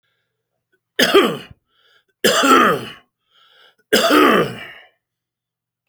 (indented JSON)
{
  "three_cough_length": "5.9 s",
  "three_cough_amplitude": 30723,
  "three_cough_signal_mean_std_ratio": 0.42,
  "survey_phase": "alpha (2021-03-01 to 2021-08-12)",
  "age": "65+",
  "gender": "Male",
  "wearing_mask": "No",
  "symptom_none": true,
  "smoker_status": "Ex-smoker",
  "respiratory_condition_asthma": false,
  "respiratory_condition_other": false,
  "recruitment_source": "REACT",
  "submission_delay": "1 day",
  "covid_test_result": "Negative",
  "covid_test_method": "RT-qPCR"
}